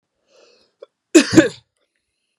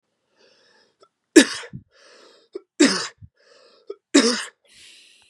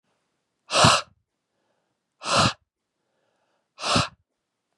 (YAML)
cough_length: 2.4 s
cough_amplitude: 32768
cough_signal_mean_std_ratio: 0.24
three_cough_length: 5.3 s
three_cough_amplitude: 32768
three_cough_signal_mean_std_ratio: 0.26
exhalation_length: 4.8 s
exhalation_amplitude: 24708
exhalation_signal_mean_std_ratio: 0.31
survey_phase: beta (2021-08-13 to 2022-03-07)
age: 18-44
gender: Male
wearing_mask: 'No'
symptom_none: true
smoker_status: Never smoked
respiratory_condition_asthma: false
respiratory_condition_other: false
recruitment_source: REACT
submission_delay: 2 days
covid_test_result: Negative
covid_test_method: RT-qPCR
influenza_a_test_result: Negative
influenza_b_test_result: Negative